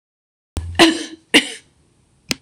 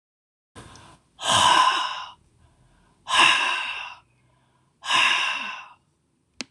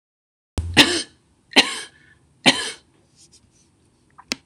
{"cough_length": "2.4 s", "cough_amplitude": 26028, "cough_signal_mean_std_ratio": 0.33, "exhalation_length": "6.5 s", "exhalation_amplitude": 20606, "exhalation_signal_mean_std_ratio": 0.47, "three_cough_length": "4.5 s", "three_cough_amplitude": 26028, "three_cough_signal_mean_std_ratio": 0.28, "survey_phase": "alpha (2021-03-01 to 2021-08-12)", "age": "65+", "gender": "Female", "wearing_mask": "No", "symptom_none": true, "smoker_status": "Ex-smoker", "respiratory_condition_asthma": false, "respiratory_condition_other": false, "recruitment_source": "REACT", "submission_delay": "31 days", "covid_test_result": "Negative", "covid_test_method": "RT-qPCR"}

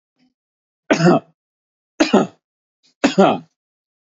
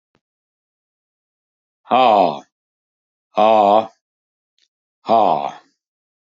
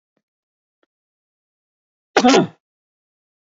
{"three_cough_length": "4.0 s", "three_cough_amplitude": 30116, "three_cough_signal_mean_std_ratio": 0.35, "exhalation_length": "6.4 s", "exhalation_amplitude": 29167, "exhalation_signal_mean_std_ratio": 0.35, "cough_length": "3.5 s", "cough_amplitude": 29231, "cough_signal_mean_std_ratio": 0.23, "survey_phase": "beta (2021-08-13 to 2022-03-07)", "age": "65+", "gender": "Male", "wearing_mask": "No", "symptom_none": true, "smoker_status": "Never smoked", "respiratory_condition_asthma": false, "respiratory_condition_other": false, "recruitment_source": "REACT", "submission_delay": "0 days", "covid_test_result": "Negative", "covid_test_method": "RT-qPCR"}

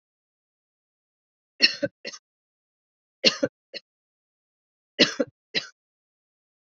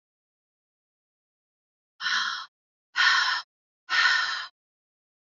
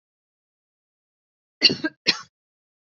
{"three_cough_length": "6.7 s", "three_cough_amplitude": 26452, "three_cough_signal_mean_std_ratio": 0.2, "exhalation_length": "5.3 s", "exhalation_amplitude": 11865, "exhalation_signal_mean_std_ratio": 0.4, "cough_length": "2.8 s", "cough_amplitude": 28480, "cough_signal_mean_std_ratio": 0.21, "survey_phase": "beta (2021-08-13 to 2022-03-07)", "age": "45-64", "gender": "Female", "wearing_mask": "No", "symptom_cough_any": true, "symptom_sore_throat": true, "symptom_other": true, "smoker_status": "Never smoked", "respiratory_condition_asthma": false, "respiratory_condition_other": false, "recruitment_source": "Test and Trace", "submission_delay": "2 days", "covid_test_result": "Positive", "covid_test_method": "RT-qPCR", "covid_ct_value": 25.0, "covid_ct_gene": "ORF1ab gene", "covid_ct_mean": 25.2, "covid_viral_load": "5400 copies/ml", "covid_viral_load_category": "Minimal viral load (< 10K copies/ml)"}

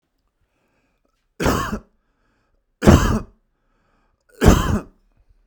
{"three_cough_length": "5.5 s", "three_cough_amplitude": 32768, "three_cough_signal_mean_std_ratio": 0.31, "survey_phase": "beta (2021-08-13 to 2022-03-07)", "age": "45-64", "gender": "Male", "wearing_mask": "No", "symptom_none": true, "smoker_status": "Never smoked", "respiratory_condition_asthma": false, "respiratory_condition_other": false, "recruitment_source": "REACT", "submission_delay": "1 day", "covid_test_result": "Negative", "covid_test_method": "RT-qPCR"}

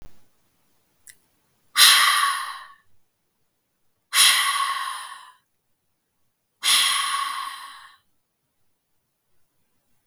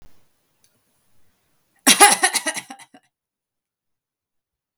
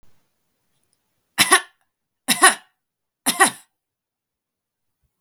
{"exhalation_length": "10.1 s", "exhalation_amplitude": 32766, "exhalation_signal_mean_std_ratio": 0.38, "cough_length": "4.8 s", "cough_amplitude": 32768, "cough_signal_mean_std_ratio": 0.24, "three_cough_length": "5.2 s", "three_cough_amplitude": 32768, "three_cough_signal_mean_std_ratio": 0.24, "survey_phase": "beta (2021-08-13 to 2022-03-07)", "age": "18-44", "gender": "Female", "wearing_mask": "No", "symptom_none": true, "smoker_status": "Ex-smoker", "respiratory_condition_asthma": false, "respiratory_condition_other": false, "recruitment_source": "REACT", "submission_delay": "3 days", "covid_test_result": "Negative", "covid_test_method": "RT-qPCR", "influenza_a_test_result": "Negative", "influenza_b_test_result": "Negative"}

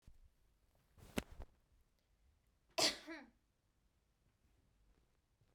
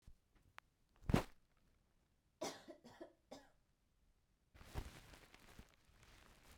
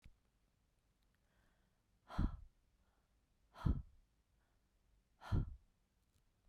{"cough_length": "5.5 s", "cough_amplitude": 2800, "cough_signal_mean_std_ratio": 0.22, "three_cough_length": "6.6 s", "three_cough_amplitude": 3334, "three_cough_signal_mean_std_ratio": 0.25, "exhalation_length": "6.5 s", "exhalation_amplitude": 2306, "exhalation_signal_mean_std_ratio": 0.25, "survey_phase": "beta (2021-08-13 to 2022-03-07)", "age": "18-44", "gender": "Female", "wearing_mask": "No", "symptom_none": true, "smoker_status": "Never smoked", "respiratory_condition_asthma": false, "respiratory_condition_other": false, "recruitment_source": "REACT", "submission_delay": "3 days", "covid_test_result": "Negative", "covid_test_method": "RT-qPCR"}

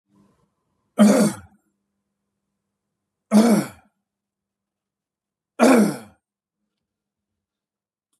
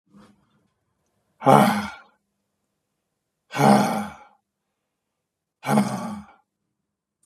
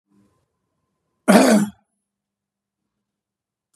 {"three_cough_length": "8.2 s", "three_cough_amplitude": 30049, "three_cough_signal_mean_std_ratio": 0.29, "exhalation_length": "7.3 s", "exhalation_amplitude": 31333, "exhalation_signal_mean_std_ratio": 0.31, "cough_length": "3.8 s", "cough_amplitude": 32591, "cough_signal_mean_std_ratio": 0.26, "survey_phase": "beta (2021-08-13 to 2022-03-07)", "age": "65+", "gender": "Male", "wearing_mask": "No", "symptom_none": true, "smoker_status": "Never smoked", "respiratory_condition_asthma": false, "respiratory_condition_other": false, "recruitment_source": "REACT", "submission_delay": "1 day", "covid_test_result": "Negative", "covid_test_method": "RT-qPCR"}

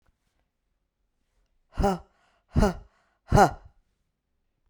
{"exhalation_length": "4.7 s", "exhalation_amplitude": 19186, "exhalation_signal_mean_std_ratio": 0.26, "survey_phase": "beta (2021-08-13 to 2022-03-07)", "age": "45-64", "gender": "Female", "wearing_mask": "No", "symptom_none": true, "smoker_status": "Ex-smoker", "respiratory_condition_asthma": false, "respiratory_condition_other": false, "recruitment_source": "REACT", "submission_delay": "1 day", "covid_test_result": "Negative", "covid_test_method": "RT-qPCR"}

